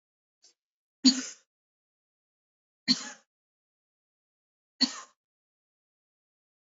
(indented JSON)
{
  "three_cough_length": "6.7 s",
  "three_cough_amplitude": 15776,
  "three_cough_signal_mean_std_ratio": 0.17,
  "survey_phase": "beta (2021-08-13 to 2022-03-07)",
  "age": "65+",
  "gender": "Female",
  "wearing_mask": "No",
  "symptom_none": true,
  "smoker_status": "Never smoked",
  "respiratory_condition_asthma": false,
  "respiratory_condition_other": false,
  "recruitment_source": "REACT",
  "submission_delay": "2 days",
  "covid_test_result": "Negative",
  "covid_test_method": "RT-qPCR",
  "influenza_a_test_result": "Negative",
  "influenza_b_test_result": "Negative"
}